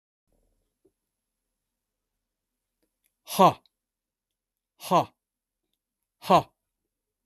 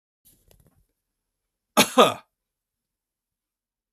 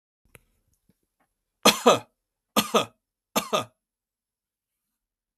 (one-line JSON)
{"exhalation_length": "7.3 s", "exhalation_amplitude": 20670, "exhalation_signal_mean_std_ratio": 0.18, "cough_length": "3.9 s", "cough_amplitude": 25773, "cough_signal_mean_std_ratio": 0.19, "three_cough_length": "5.4 s", "three_cough_amplitude": 25781, "three_cough_signal_mean_std_ratio": 0.24, "survey_phase": "beta (2021-08-13 to 2022-03-07)", "age": "65+", "gender": "Male", "wearing_mask": "No", "symptom_none": true, "smoker_status": "Ex-smoker", "respiratory_condition_asthma": false, "respiratory_condition_other": false, "recruitment_source": "REACT", "submission_delay": "1 day", "covid_test_result": "Negative", "covid_test_method": "RT-qPCR", "influenza_a_test_result": "Negative", "influenza_b_test_result": "Negative"}